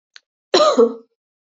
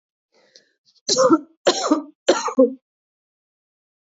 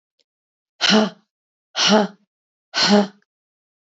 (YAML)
cough_length: 1.5 s
cough_amplitude: 25696
cough_signal_mean_std_ratio: 0.41
three_cough_length: 4.1 s
three_cough_amplitude: 24671
three_cough_signal_mean_std_ratio: 0.37
exhalation_length: 3.9 s
exhalation_amplitude: 26311
exhalation_signal_mean_std_ratio: 0.37
survey_phase: beta (2021-08-13 to 2022-03-07)
age: 18-44
gender: Female
wearing_mask: 'No'
symptom_cough_any: true
symptom_runny_or_blocked_nose: true
symptom_shortness_of_breath: true
symptom_abdominal_pain: true
symptom_diarrhoea: true
symptom_fatigue: true
symptom_headache: true
symptom_change_to_sense_of_smell_or_taste: true
symptom_loss_of_taste: true
symptom_onset: 9 days
smoker_status: Ex-smoker
respiratory_condition_asthma: false
respiratory_condition_other: false
recruitment_source: REACT
submission_delay: 1 day
covid_test_result: Positive
covid_test_method: RT-qPCR
covid_ct_value: 32.0
covid_ct_gene: E gene
influenza_a_test_result: Unknown/Void
influenza_b_test_result: Unknown/Void